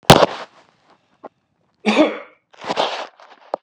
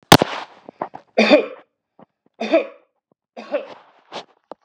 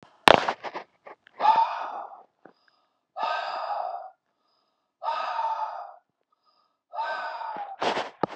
{
  "cough_length": "3.6 s",
  "cough_amplitude": 32768,
  "cough_signal_mean_std_ratio": 0.32,
  "three_cough_length": "4.6 s",
  "three_cough_amplitude": 32768,
  "three_cough_signal_mean_std_ratio": 0.29,
  "exhalation_length": "8.4 s",
  "exhalation_amplitude": 32768,
  "exhalation_signal_mean_std_ratio": 0.41,
  "survey_phase": "beta (2021-08-13 to 2022-03-07)",
  "age": "45-64",
  "gender": "Male",
  "wearing_mask": "No",
  "symptom_none": true,
  "smoker_status": "Never smoked",
  "respiratory_condition_asthma": false,
  "respiratory_condition_other": false,
  "recruitment_source": "Test and Trace",
  "submission_delay": "1 day",
  "covid_test_result": "Negative",
  "covid_test_method": "RT-qPCR"
}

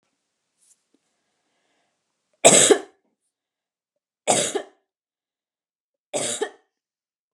{
  "three_cough_length": "7.3 s",
  "three_cough_amplitude": 32767,
  "three_cough_signal_mean_std_ratio": 0.23,
  "survey_phase": "beta (2021-08-13 to 2022-03-07)",
  "age": "45-64",
  "gender": "Female",
  "wearing_mask": "No",
  "symptom_none": true,
  "smoker_status": "Never smoked",
  "respiratory_condition_asthma": false,
  "respiratory_condition_other": false,
  "recruitment_source": "REACT",
  "submission_delay": "3 days",
  "covid_test_result": "Negative",
  "covid_test_method": "RT-qPCR",
  "influenza_a_test_result": "Unknown/Void",
  "influenza_b_test_result": "Unknown/Void"
}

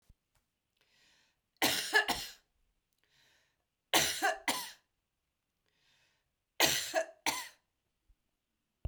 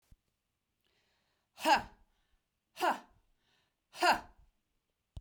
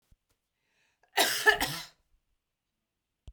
{
  "three_cough_length": "8.9 s",
  "three_cough_amplitude": 9246,
  "three_cough_signal_mean_std_ratio": 0.33,
  "exhalation_length": "5.2 s",
  "exhalation_amplitude": 5883,
  "exhalation_signal_mean_std_ratio": 0.26,
  "cough_length": "3.3 s",
  "cough_amplitude": 12304,
  "cough_signal_mean_std_ratio": 0.29,
  "survey_phase": "beta (2021-08-13 to 2022-03-07)",
  "age": "45-64",
  "gender": "Female",
  "wearing_mask": "No",
  "symptom_none": true,
  "smoker_status": "Never smoked",
  "respiratory_condition_asthma": false,
  "respiratory_condition_other": false,
  "recruitment_source": "REACT",
  "submission_delay": "3 days",
  "covid_test_result": "Negative",
  "covid_test_method": "RT-qPCR"
}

